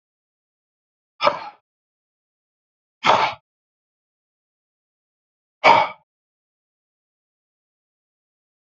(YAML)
exhalation_length: 8.6 s
exhalation_amplitude: 27861
exhalation_signal_mean_std_ratio: 0.2
survey_phase: beta (2021-08-13 to 2022-03-07)
age: 45-64
gender: Male
wearing_mask: 'No'
symptom_none: true
smoker_status: Current smoker (1 to 10 cigarettes per day)
respiratory_condition_asthma: false
respiratory_condition_other: false
recruitment_source: REACT
submission_delay: 1 day
covid_test_result: Negative
covid_test_method: RT-qPCR
influenza_a_test_result: Negative
influenza_b_test_result: Negative